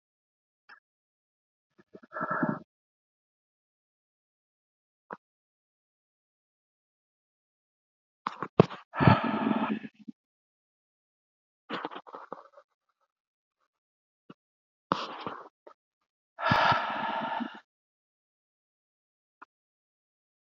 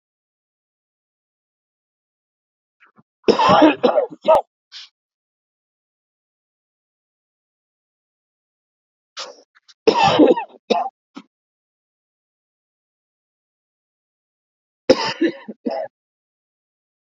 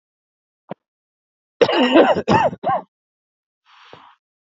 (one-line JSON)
{"exhalation_length": "20.6 s", "exhalation_amplitude": 27342, "exhalation_signal_mean_std_ratio": 0.25, "three_cough_length": "17.1 s", "three_cough_amplitude": 32768, "three_cough_signal_mean_std_ratio": 0.26, "cough_length": "4.4 s", "cough_amplitude": 32767, "cough_signal_mean_std_ratio": 0.37, "survey_phase": "beta (2021-08-13 to 2022-03-07)", "age": "45-64", "gender": "Male", "wearing_mask": "No", "symptom_cough_any": true, "symptom_runny_or_blocked_nose": true, "symptom_shortness_of_breath": true, "symptom_sore_throat": true, "symptom_headache": true, "symptom_other": true, "smoker_status": "Current smoker (1 to 10 cigarettes per day)", "respiratory_condition_asthma": false, "respiratory_condition_other": false, "recruitment_source": "Test and Trace", "submission_delay": "1 day", "covid_test_result": "Positive", "covid_test_method": "RT-qPCR", "covid_ct_value": 18.1, "covid_ct_gene": "ORF1ab gene", "covid_ct_mean": 19.3, "covid_viral_load": "470000 copies/ml", "covid_viral_load_category": "Low viral load (10K-1M copies/ml)"}